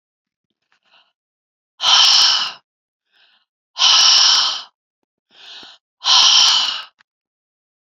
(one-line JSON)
{"exhalation_length": "7.9 s", "exhalation_amplitude": 32768, "exhalation_signal_mean_std_ratio": 0.44, "survey_phase": "beta (2021-08-13 to 2022-03-07)", "age": "65+", "gender": "Female", "wearing_mask": "No", "symptom_none": true, "smoker_status": "Ex-smoker", "respiratory_condition_asthma": false, "respiratory_condition_other": false, "recruitment_source": "REACT", "submission_delay": "4 days", "covid_test_result": "Negative", "covid_test_method": "RT-qPCR"}